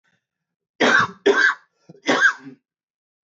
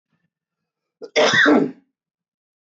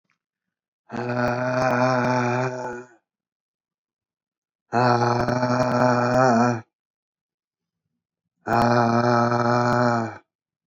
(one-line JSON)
{"three_cough_length": "3.3 s", "three_cough_amplitude": 19328, "three_cough_signal_mean_std_ratio": 0.42, "cough_length": "2.6 s", "cough_amplitude": 20450, "cough_signal_mean_std_ratio": 0.38, "exhalation_length": "10.7 s", "exhalation_amplitude": 18353, "exhalation_signal_mean_std_ratio": 0.62, "survey_phase": "beta (2021-08-13 to 2022-03-07)", "age": "45-64", "gender": "Male", "wearing_mask": "No", "symptom_none": true, "smoker_status": "Never smoked", "respiratory_condition_asthma": false, "respiratory_condition_other": false, "recruitment_source": "REACT", "submission_delay": "4 days", "covid_test_result": "Negative", "covid_test_method": "RT-qPCR", "influenza_a_test_result": "Negative", "influenza_b_test_result": "Negative"}